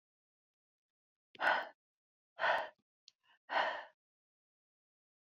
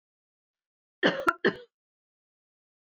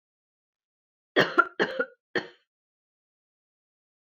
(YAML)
exhalation_length: 5.2 s
exhalation_amplitude: 4801
exhalation_signal_mean_std_ratio: 0.31
cough_length: 2.8 s
cough_amplitude: 11400
cough_signal_mean_std_ratio: 0.25
three_cough_length: 4.2 s
three_cough_amplitude: 16242
three_cough_signal_mean_std_ratio: 0.24
survey_phase: beta (2021-08-13 to 2022-03-07)
age: 45-64
gender: Female
wearing_mask: 'No'
symptom_none: true
smoker_status: Never smoked
respiratory_condition_asthma: false
respiratory_condition_other: false
recruitment_source: REACT
submission_delay: 2 days
covid_test_result: Negative
covid_test_method: RT-qPCR